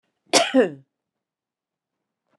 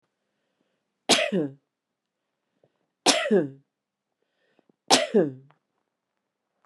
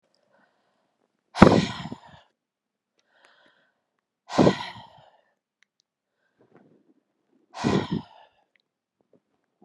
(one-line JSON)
{"cough_length": "2.4 s", "cough_amplitude": 29956, "cough_signal_mean_std_ratio": 0.28, "three_cough_length": "6.7 s", "three_cough_amplitude": 32649, "three_cough_signal_mean_std_ratio": 0.3, "exhalation_length": "9.6 s", "exhalation_amplitude": 32768, "exhalation_signal_mean_std_ratio": 0.21, "survey_phase": "beta (2021-08-13 to 2022-03-07)", "age": "65+", "gender": "Female", "wearing_mask": "No", "symptom_none": true, "smoker_status": "Never smoked", "respiratory_condition_asthma": false, "respiratory_condition_other": false, "recruitment_source": "REACT", "submission_delay": "3 days", "covid_test_result": "Negative", "covid_test_method": "RT-qPCR", "influenza_a_test_result": "Negative", "influenza_b_test_result": "Negative"}